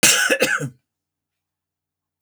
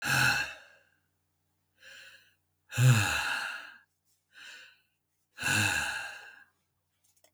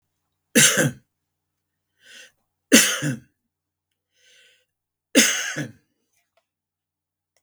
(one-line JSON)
{"cough_length": "2.2 s", "cough_amplitude": 32766, "cough_signal_mean_std_ratio": 0.4, "exhalation_length": "7.3 s", "exhalation_amplitude": 9803, "exhalation_signal_mean_std_ratio": 0.42, "three_cough_length": "7.4 s", "three_cough_amplitude": 32766, "three_cough_signal_mean_std_ratio": 0.28, "survey_phase": "beta (2021-08-13 to 2022-03-07)", "age": "65+", "gender": "Male", "wearing_mask": "No", "symptom_none": true, "smoker_status": "Never smoked", "respiratory_condition_asthma": false, "respiratory_condition_other": false, "recruitment_source": "REACT", "submission_delay": "2 days", "covid_test_result": "Negative", "covid_test_method": "RT-qPCR", "influenza_a_test_result": "Negative", "influenza_b_test_result": "Negative"}